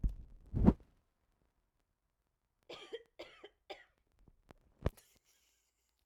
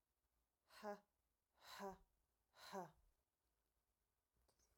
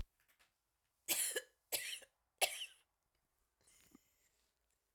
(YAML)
cough_length: 6.1 s
cough_amplitude: 9161
cough_signal_mean_std_ratio: 0.2
exhalation_length: 4.8 s
exhalation_amplitude: 359
exhalation_signal_mean_std_ratio: 0.33
three_cough_length: 4.9 s
three_cough_amplitude: 4104
three_cough_signal_mean_std_ratio: 0.3
survey_phase: alpha (2021-03-01 to 2021-08-12)
age: 45-64
gender: Female
wearing_mask: 'No'
symptom_none: true
symptom_onset: 9 days
smoker_status: Ex-smoker
respiratory_condition_asthma: false
respiratory_condition_other: false
recruitment_source: REACT
submission_delay: 12 days
covid_test_result: Negative
covid_test_method: RT-qPCR